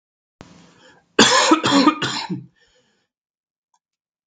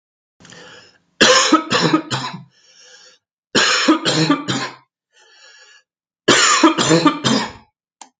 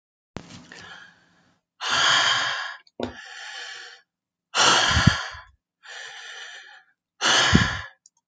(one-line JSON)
{"cough_length": "4.3 s", "cough_amplitude": 32767, "cough_signal_mean_std_ratio": 0.38, "three_cough_length": "8.2 s", "three_cough_amplitude": 32767, "three_cough_signal_mean_std_ratio": 0.5, "exhalation_length": "8.3 s", "exhalation_amplitude": 31432, "exhalation_signal_mean_std_ratio": 0.46, "survey_phase": "beta (2021-08-13 to 2022-03-07)", "age": "18-44", "gender": "Male", "wearing_mask": "No", "symptom_change_to_sense_of_smell_or_taste": true, "symptom_loss_of_taste": true, "symptom_onset": "12 days", "smoker_status": "Never smoked", "respiratory_condition_asthma": false, "respiratory_condition_other": false, "recruitment_source": "REACT", "submission_delay": "1 day", "covid_test_result": "Negative", "covid_test_method": "RT-qPCR", "influenza_a_test_result": "Negative", "influenza_b_test_result": "Negative"}